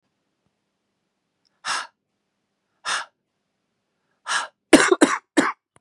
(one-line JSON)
{"exhalation_length": "5.8 s", "exhalation_amplitude": 32768, "exhalation_signal_mean_std_ratio": 0.26, "survey_phase": "beta (2021-08-13 to 2022-03-07)", "age": "45-64", "gender": "Female", "wearing_mask": "No", "symptom_cough_any": true, "symptom_runny_or_blocked_nose": true, "symptom_sore_throat": true, "symptom_fatigue": true, "symptom_headache": true, "symptom_change_to_sense_of_smell_or_taste": true, "symptom_onset": "2 days", "smoker_status": "Never smoked", "respiratory_condition_asthma": true, "respiratory_condition_other": false, "recruitment_source": "Test and Trace", "submission_delay": "1 day", "covid_test_result": "Positive", "covid_test_method": "RT-qPCR", "covid_ct_value": 21.8, "covid_ct_gene": "N gene", "covid_ct_mean": 22.3, "covid_viral_load": "50000 copies/ml", "covid_viral_load_category": "Low viral load (10K-1M copies/ml)"}